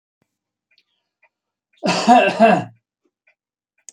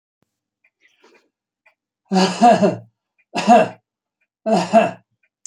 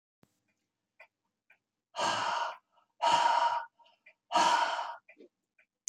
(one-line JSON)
{"cough_length": "3.9 s", "cough_amplitude": 27863, "cough_signal_mean_std_ratio": 0.33, "three_cough_length": "5.5 s", "three_cough_amplitude": 28323, "three_cough_signal_mean_std_ratio": 0.38, "exhalation_length": "5.9 s", "exhalation_amplitude": 5984, "exhalation_signal_mean_std_ratio": 0.45, "survey_phase": "beta (2021-08-13 to 2022-03-07)", "age": "65+", "gender": "Male", "wearing_mask": "No", "symptom_none": true, "smoker_status": "Never smoked", "respiratory_condition_asthma": false, "respiratory_condition_other": false, "recruitment_source": "REACT", "submission_delay": "2 days", "covid_test_result": "Negative", "covid_test_method": "RT-qPCR"}